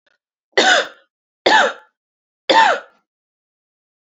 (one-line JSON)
{"three_cough_length": "4.0 s", "three_cough_amplitude": 28760, "three_cough_signal_mean_std_ratio": 0.37, "survey_phase": "alpha (2021-03-01 to 2021-08-12)", "age": "18-44", "gender": "Female", "wearing_mask": "No", "symptom_none": true, "smoker_status": "Current smoker (1 to 10 cigarettes per day)", "respiratory_condition_asthma": true, "respiratory_condition_other": false, "recruitment_source": "Test and Trace", "submission_delay": "2 days", "covid_test_result": "Positive", "covid_test_method": "RT-qPCR", "covid_ct_value": 20.7, "covid_ct_gene": "N gene", "covid_ct_mean": 21.4, "covid_viral_load": "96000 copies/ml", "covid_viral_load_category": "Low viral load (10K-1M copies/ml)"}